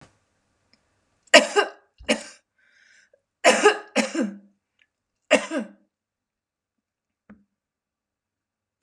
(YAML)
three_cough_length: 8.8 s
three_cough_amplitude: 32545
three_cough_signal_mean_std_ratio: 0.25
survey_phase: beta (2021-08-13 to 2022-03-07)
age: 65+
gender: Female
wearing_mask: 'No'
symptom_cough_any: true
symptom_runny_or_blocked_nose: true
symptom_change_to_sense_of_smell_or_taste: true
symptom_onset: 6 days
smoker_status: Never smoked
respiratory_condition_asthma: false
respiratory_condition_other: false
recruitment_source: REACT
submission_delay: 2 days
covid_test_result: Negative
covid_test_method: RT-qPCR
influenza_a_test_result: Negative
influenza_b_test_result: Negative